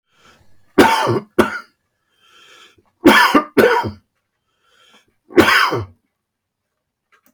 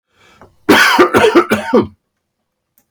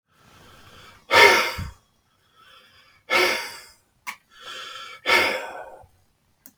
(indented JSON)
{
  "three_cough_length": "7.3 s",
  "three_cough_amplitude": 32768,
  "three_cough_signal_mean_std_ratio": 0.38,
  "cough_length": "2.9 s",
  "cough_amplitude": 32768,
  "cough_signal_mean_std_ratio": 0.5,
  "exhalation_length": "6.6 s",
  "exhalation_amplitude": 32766,
  "exhalation_signal_mean_std_ratio": 0.36,
  "survey_phase": "beta (2021-08-13 to 2022-03-07)",
  "age": "65+",
  "gender": "Male",
  "wearing_mask": "No",
  "symptom_none": true,
  "smoker_status": "Never smoked",
  "respiratory_condition_asthma": false,
  "respiratory_condition_other": false,
  "recruitment_source": "REACT",
  "submission_delay": "3 days",
  "covid_test_result": "Negative",
  "covid_test_method": "RT-qPCR",
  "influenza_a_test_result": "Negative",
  "influenza_b_test_result": "Negative"
}